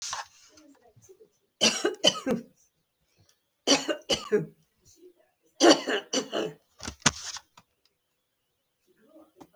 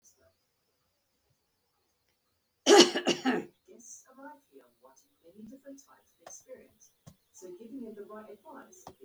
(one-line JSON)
{"three_cough_length": "9.6 s", "three_cough_amplitude": 26062, "three_cough_signal_mean_std_ratio": 0.32, "cough_length": "9.0 s", "cough_amplitude": 18909, "cough_signal_mean_std_ratio": 0.22, "survey_phase": "beta (2021-08-13 to 2022-03-07)", "age": "65+", "gender": "Female", "wearing_mask": "No", "symptom_fatigue": true, "symptom_onset": "12 days", "smoker_status": "Ex-smoker", "respiratory_condition_asthma": false, "respiratory_condition_other": false, "recruitment_source": "REACT", "submission_delay": "6 days", "covid_test_result": "Negative", "covid_test_method": "RT-qPCR", "influenza_a_test_result": "Negative", "influenza_b_test_result": "Negative"}